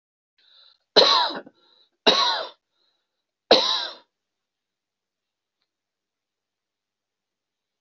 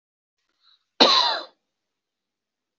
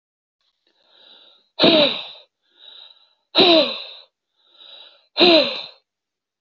{
  "three_cough_length": "7.8 s",
  "three_cough_amplitude": 30724,
  "three_cough_signal_mean_std_ratio": 0.27,
  "cough_length": "2.8 s",
  "cough_amplitude": 26175,
  "cough_signal_mean_std_ratio": 0.28,
  "exhalation_length": "6.4 s",
  "exhalation_amplitude": 27975,
  "exhalation_signal_mean_std_ratio": 0.35,
  "survey_phase": "beta (2021-08-13 to 2022-03-07)",
  "age": "45-64",
  "gender": "Male",
  "wearing_mask": "No",
  "symptom_none": true,
  "smoker_status": "Never smoked",
  "respiratory_condition_asthma": false,
  "respiratory_condition_other": false,
  "recruitment_source": "REACT",
  "submission_delay": "1 day",
  "covid_test_result": "Negative",
  "covid_test_method": "RT-qPCR",
  "influenza_a_test_result": "Negative",
  "influenza_b_test_result": "Negative"
}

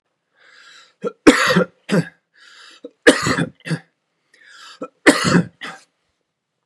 {
  "three_cough_length": "6.7 s",
  "three_cough_amplitude": 32768,
  "three_cough_signal_mean_std_ratio": 0.34,
  "survey_phase": "beta (2021-08-13 to 2022-03-07)",
  "age": "45-64",
  "gender": "Male",
  "wearing_mask": "No",
  "symptom_none": true,
  "smoker_status": "Never smoked",
  "respiratory_condition_asthma": false,
  "respiratory_condition_other": false,
  "recruitment_source": "REACT",
  "submission_delay": "2 days",
  "covid_test_result": "Negative",
  "covid_test_method": "RT-qPCR",
  "influenza_a_test_result": "Negative",
  "influenza_b_test_result": "Negative"
}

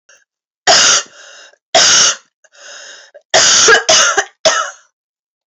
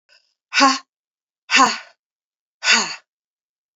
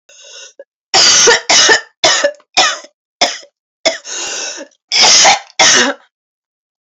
{
  "three_cough_length": "5.5 s",
  "three_cough_amplitude": 32768,
  "three_cough_signal_mean_std_ratio": 0.52,
  "exhalation_length": "3.8 s",
  "exhalation_amplitude": 29832,
  "exhalation_signal_mean_std_ratio": 0.34,
  "cough_length": "6.8 s",
  "cough_amplitude": 32768,
  "cough_signal_mean_std_ratio": 0.54,
  "survey_phase": "beta (2021-08-13 to 2022-03-07)",
  "age": "45-64",
  "gender": "Female",
  "wearing_mask": "No",
  "symptom_cough_any": true,
  "symptom_runny_or_blocked_nose": true,
  "symptom_sore_throat": true,
  "symptom_fatigue": true,
  "symptom_headache": true,
  "smoker_status": "Never smoked",
  "respiratory_condition_asthma": false,
  "respiratory_condition_other": false,
  "recruitment_source": "Test and Trace",
  "submission_delay": "2 days",
  "covid_test_result": "Positive",
  "covid_test_method": "RT-qPCR"
}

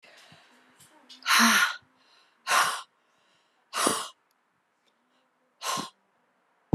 {
  "exhalation_length": "6.7 s",
  "exhalation_amplitude": 15651,
  "exhalation_signal_mean_std_ratio": 0.34,
  "survey_phase": "beta (2021-08-13 to 2022-03-07)",
  "age": "45-64",
  "gender": "Female",
  "wearing_mask": "No",
  "symptom_cough_any": true,
  "symptom_runny_or_blocked_nose": true,
  "symptom_sore_throat": true,
  "symptom_fatigue": true,
  "symptom_fever_high_temperature": true,
  "symptom_headache": true,
  "symptom_onset": "3 days",
  "smoker_status": "Never smoked",
  "respiratory_condition_asthma": false,
  "respiratory_condition_other": false,
  "recruitment_source": "Test and Trace",
  "submission_delay": "2 days",
  "covid_test_result": "Positive",
  "covid_test_method": "RT-qPCR",
  "covid_ct_value": 21.2,
  "covid_ct_gene": "ORF1ab gene",
  "covid_ct_mean": 21.8,
  "covid_viral_load": "69000 copies/ml",
  "covid_viral_load_category": "Low viral load (10K-1M copies/ml)"
}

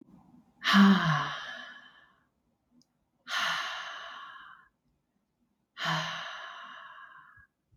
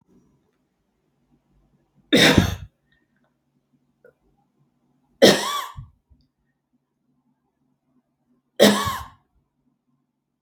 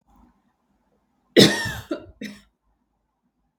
{
  "exhalation_length": "7.8 s",
  "exhalation_amplitude": 10498,
  "exhalation_signal_mean_std_ratio": 0.37,
  "three_cough_length": "10.4 s",
  "three_cough_amplitude": 32768,
  "three_cough_signal_mean_std_ratio": 0.24,
  "cough_length": "3.6 s",
  "cough_amplitude": 32768,
  "cough_signal_mean_std_ratio": 0.24,
  "survey_phase": "beta (2021-08-13 to 2022-03-07)",
  "age": "45-64",
  "gender": "Female",
  "wearing_mask": "No",
  "symptom_none": true,
  "smoker_status": "Never smoked",
  "respiratory_condition_asthma": false,
  "respiratory_condition_other": false,
  "recruitment_source": "REACT",
  "submission_delay": "1 day",
  "covid_test_result": "Negative",
  "covid_test_method": "RT-qPCR"
}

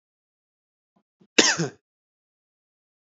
{
  "cough_length": "3.1 s",
  "cough_amplitude": 27899,
  "cough_signal_mean_std_ratio": 0.2,
  "survey_phase": "alpha (2021-03-01 to 2021-08-12)",
  "age": "18-44",
  "gender": "Male",
  "wearing_mask": "No",
  "symptom_change_to_sense_of_smell_or_taste": true,
  "symptom_loss_of_taste": true,
  "symptom_onset": "8 days",
  "smoker_status": "Current smoker (1 to 10 cigarettes per day)",
  "recruitment_source": "Test and Trace",
  "submission_delay": "6 days",
  "covid_test_result": "Positive",
  "covid_test_method": "RT-qPCR",
  "covid_ct_value": 33.2,
  "covid_ct_gene": "ORF1ab gene",
  "covid_ct_mean": 33.2,
  "covid_viral_load": "13 copies/ml",
  "covid_viral_load_category": "Minimal viral load (< 10K copies/ml)"
}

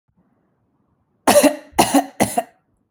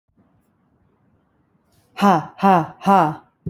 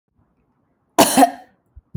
{
  "three_cough_length": "2.9 s",
  "three_cough_amplitude": 31857,
  "three_cough_signal_mean_std_ratio": 0.37,
  "exhalation_length": "3.5 s",
  "exhalation_amplitude": 27720,
  "exhalation_signal_mean_std_ratio": 0.36,
  "cough_length": "2.0 s",
  "cough_amplitude": 32768,
  "cough_signal_mean_std_ratio": 0.3,
  "survey_phase": "alpha (2021-03-01 to 2021-08-12)",
  "age": "18-44",
  "gender": "Female",
  "wearing_mask": "No",
  "symptom_none": true,
  "smoker_status": "Ex-smoker",
  "respiratory_condition_asthma": false,
  "respiratory_condition_other": false,
  "recruitment_source": "REACT",
  "submission_delay": "2 days",
  "covid_test_result": "Negative",
  "covid_test_method": "RT-qPCR"
}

